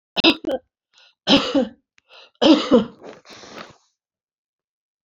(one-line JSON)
{"three_cough_length": "5.0 s", "three_cough_amplitude": 27945, "three_cough_signal_mean_std_ratio": 0.35, "survey_phase": "beta (2021-08-13 to 2022-03-07)", "age": "45-64", "gender": "Female", "wearing_mask": "No", "symptom_none": true, "smoker_status": "Never smoked", "respiratory_condition_asthma": false, "respiratory_condition_other": false, "recruitment_source": "REACT", "submission_delay": "2 days", "covid_test_result": "Negative", "covid_test_method": "RT-qPCR", "influenza_a_test_result": "Negative", "influenza_b_test_result": "Negative"}